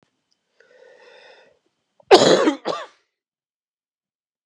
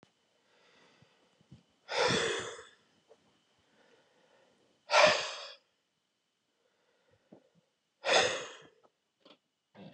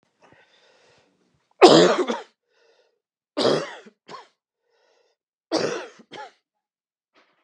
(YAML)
cough_length: 4.5 s
cough_amplitude: 32768
cough_signal_mean_std_ratio: 0.25
exhalation_length: 9.9 s
exhalation_amplitude: 11447
exhalation_signal_mean_std_ratio: 0.29
three_cough_length: 7.4 s
three_cough_amplitude: 32767
three_cough_signal_mean_std_ratio: 0.26
survey_phase: beta (2021-08-13 to 2022-03-07)
age: 45-64
gender: Male
wearing_mask: 'No'
symptom_cough_any: true
symptom_new_continuous_cough: true
symptom_runny_or_blocked_nose: true
symptom_shortness_of_breath: true
symptom_sore_throat: true
symptom_fatigue: true
symptom_onset: 4 days
smoker_status: Never smoked
respiratory_condition_asthma: false
respiratory_condition_other: false
recruitment_source: Test and Trace
submission_delay: 2 days
covid_test_result: Positive
covid_test_method: LAMP